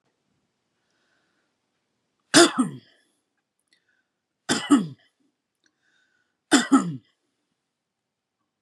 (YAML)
three_cough_length: 8.6 s
three_cough_amplitude: 30485
three_cough_signal_mean_std_ratio: 0.23
survey_phase: beta (2021-08-13 to 2022-03-07)
age: 45-64
gender: Male
wearing_mask: 'No'
symptom_none: true
smoker_status: Never smoked
respiratory_condition_asthma: true
respiratory_condition_other: false
recruitment_source: REACT
submission_delay: 1 day
covid_test_result: Negative
covid_test_method: RT-qPCR